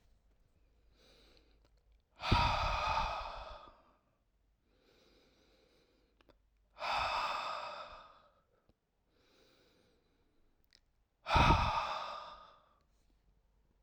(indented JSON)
{
  "exhalation_length": "13.8 s",
  "exhalation_amplitude": 6073,
  "exhalation_signal_mean_std_ratio": 0.36,
  "survey_phase": "alpha (2021-03-01 to 2021-08-12)",
  "age": "18-44",
  "gender": "Male",
  "wearing_mask": "No",
  "symptom_none": true,
  "smoker_status": "Never smoked",
  "respiratory_condition_asthma": false,
  "respiratory_condition_other": false,
  "recruitment_source": "REACT",
  "submission_delay": "2 days",
  "covid_test_result": "Negative",
  "covid_test_method": "RT-qPCR"
}